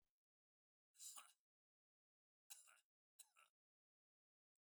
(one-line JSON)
{"cough_length": "4.6 s", "cough_amplitude": 249, "cough_signal_mean_std_ratio": 0.27, "survey_phase": "alpha (2021-03-01 to 2021-08-12)", "age": "65+", "gender": "Male", "wearing_mask": "No", "symptom_none": true, "smoker_status": "Never smoked", "respiratory_condition_asthma": false, "respiratory_condition_other": false, "recruitment_source": "REACT", "submission_delay": "2 days", "covid_test_result": "Negative", "covid_test_method": "RT-qPCR"}